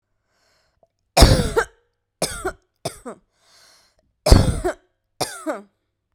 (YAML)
cough_length: 6.1 s
cough_amplitude: 32768
cough_signal_mean_std_ratio: 0.31
survey_phase: beta (2021-08-13 to 2022-03-07)
age: 18-44
gender: Female
wearing_mask: 'No'
symptom_none: true
smoker_status: Current smoker (1 to 10 cigarettes per day)
respiratory_condition_asthma: false
respiratory_condition_other: false
recruitment_source: REACT
submission_delay: 3 days
covid_test_result: Negative
covid_test_method: RT-qPCR
influenza_a_test_result: Negative
influenza_b_test_result: Negative